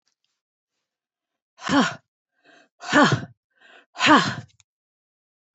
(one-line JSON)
{"exhalation_length": "5.5 s", "exhalation_amplitude": 26583, "exhalation_signal_mean_std_ratio": 0.3, "survey_phase": "beta (2021-08-13 to 2022-03-07)", "age": "65+", "gender": "Female", "wearing_mask": "No", "symptom_none": true, "smoker_status": "Never smoked", "respiratory_condition_asthma": false, "respiratory_condition_other": false, "recruitment_source": "REACT", "submission_delay": "2 days", "covid_test_result": "Negative", "covid_test_method": "RT-qPCR"}